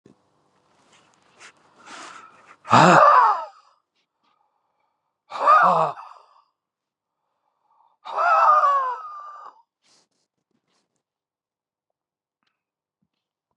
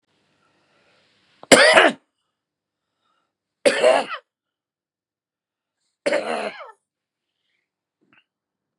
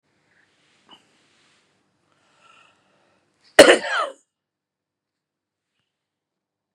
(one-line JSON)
{"exhalation_length": "13.6 s", "exhalation_amplitude": 31866, "exhalation_signal_mean_std_ratio": 0.33, "three_cough_length": "8.8 s", "three_cough_amplitude": 32768, "three_cough_signal_mean_std_ratio": 0.26, "cough_length": "6.7 s", "cough_amplitude": 32768, "cough_signal_mean_std_ratio": 0.16, "survey_phase": "beta (2021-08-13 to 2022-03-07)", "age": "45-64", "gender": "Male", "wearing_mask": "No", "symptom_sore_throat": true, "symptom_headache": true, "smoker_status": "Never smoked", "respiratory_condition_asthma": false, "respiratory_condition_other": false, "recruitment_source": "REACT", "submission_delay": "2 days", "covid_test_result": "Negative", "covid_test_method": "RT-qPCR", "influenza_a_test_result": "Negative", "influenza_b_test_result": "Negative"}